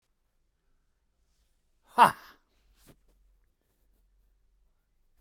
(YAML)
exhalation_length: 5.2 s
exhalation_amplitude: 16073
exhalation_signal_mean_std_ratio: 0.13
survey_phase: beta (2021-08-13 to 2022-03-07)
age: 45-64
gender: Male
wearing_mask: 'No'
symptom_none: true
smoker_status: Ex-smoker
respiratory_condition_asthma: true
respiratory_condition_other: true
recruitment_source: REACT
submission_delay: 6 days
covid_test_result: Negative
covid_test_method: RT-qPCR